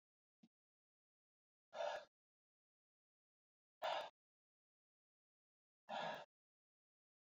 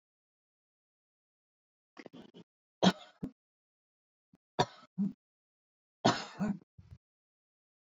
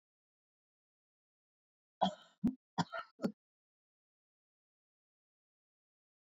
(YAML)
exhalation_length: 7.3 s
exhalation_amplitude: 780
exhalation_signal_mean_std_ratio: 0.27
three_cough_length: 7.9 s
three_cough_amplitude: 7551
three_cough_signal_mean_std_ratio: 0.22
cough_length: 6.3 s
cough_amplitude: 4198
cough_signal_mean_std_ratio: 0.19
survey_phase: beta (2021-08-13 to 2022-03-07)
age: 65+
gender: Female
wearing_mask: 'No'
symptom_shortness_of_breath: true
symptom_onset: 13 days
smoker_status: Never smoked
respiratory_condition_asthma: false
respiratory_condition_other: false
recruitment_source: REACT
submission_delay: 1 day
covid_test_result: Negative
covid_test_method: RT-qPCR